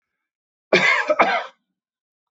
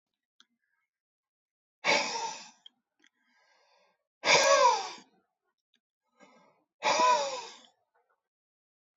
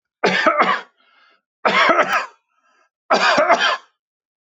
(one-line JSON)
{"cough_length": "2.3 s", "cough_amplitude": 25004, "cough_signal_mean_std_ratio": 0.42, "exhalation_length": "9.0 s", "exhalation_amplitude": 12294, "exhalation_signal_mean_std_ratio": 0.33, "three_cough_length": "4.4 s", "three_cough_amplitude": 25265, "three_cough_signal_mean_std_ratio": 0.54, "survey_phase": "beta (2021-08-13 to 2022-03-07)", "age": "65+", "gender": "Male", "wearing_mask": "No", "symptom_none": true, "smoker_status": "Never smoked", "respiratory_condition_asthma": false, "respiratory_condition_other": false, "recruitment_source": "Test and Trace", "submission_delay": "1 day", "covid_test_result": "Negative", "covid_test_method": "RT-qPCR"}